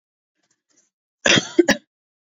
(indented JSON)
{
  "cough_length": "2.4 s",
  "cough_amplitude": 31789,
  "cough_signal_mean_std_ratio": 0.26,
  "survey_phase": "beta (2021-08-13 to 2022-03-07)",
  "age": "18-44",
  "gender": "Female",
  "wearing_mask": "No",
  "symptom_cough_any": true,
  "symptom_sore_throat": true,
  "smoker_status": "Never smoked",
  "respiratory_condition_asthma": false,
  "respiratory_condition_other": false,
  "recruitment_source": "Test and Trace",
  "submission_delay": "2 days",
  "covid_test_result": "Positive",
  "covid_test_method": "RT-qPCR",
  "covid_ct_value": 29.3,
  "covid_ct_gene": "ORF1ab gene"
}